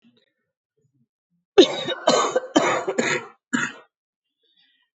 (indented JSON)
{
  "three_cough_length": "4.9 s",
  "three_cough_amplitude": 27483,
  "three_cough_signal_mean_std_ratio": 0.37,
  "survey_phase": "beta (2021-08-13 to 2022-03-07)",
  "age": "45-64",
  "gender": "Female",
  "wearing_mask": "No",
  "symptom_cough_any": true,
  "symptom_runny_or_blocked_nose": true,
  "symptom_sore_throat": true,
  "symptom_diarrhoea": true,
  "symptom_headache": true,
  "symptom_onset": "3 days",
  "smoker_status": "Never smoked",
  "respiratory_condition_asthma": false,
  "respiratory_condition_other": false,
  "recruitment_source": "Test and Trace",
  "submission_delay": "1 day",
  "covid_test_result": "Negative",
  "covid_test_method": "RT-qPCR"
}